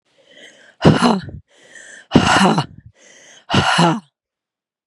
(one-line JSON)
{"exhalation_length": "4.9 s", "exhalation_amplitude": 32768, "exhalation_signal_mean_std_ratio": 0.44, "survey_phase": "beta (2021-08-13 to 2022-03-07)", "age": "45-64", "gender": "Female", "wearing_mask": "No", "symptom_cough_any": true, "symptom_runny_or_blocked_nose": true, "symptom_shortness_of_breath": true, "symptom_sore_throat": true, "symptom_abdominal_pain": true, "symptom_fatigue": true, "symptom_headache": true, "symptom_change_to_sense_of_smell_or_taste": true, "symptom_onset": "4 days", "smoker_status": "Never smoked", "respiratory_condition_asthma": true, "respiratory_condition_other": false, "recruitment_source": "Test and Trace", "submission_delay": "2 days", "covid_test_result": "Positive", "covid_test_method": "RT-qPCR", "covid_ct_value": 16.1, "covid_ct_gene": "N gene", "covid_ct_mean": 16.1, "covid_viral_load": "5300000 copies/ml", "covid_viral_load_category": "High viral load (>1M copies/ml)"}